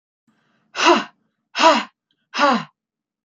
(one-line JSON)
{"exhalation_length": "3.2 s", "exhalation_amplitude": 27524, "exhalation_signal_mean_std_ratio": 0.38, "survey_phase": "beta (2021-08-13 to 2022-03-07)", "age": "45-64", "gender": "Female", "wearing_mask": "No", "symptom_none": true, "smoker_status": "Never smoked", "respiratory_condition_asthma": false, "respiratory_condition_other": false, "recruitment_source": "REACT", "submission_delay": "2 days", "covid_test_result": "Negative", "covid_test_method": "RT-qPCR", "influenza_a_test_result": "Negative", "influenza_b_test_result": "Negative"}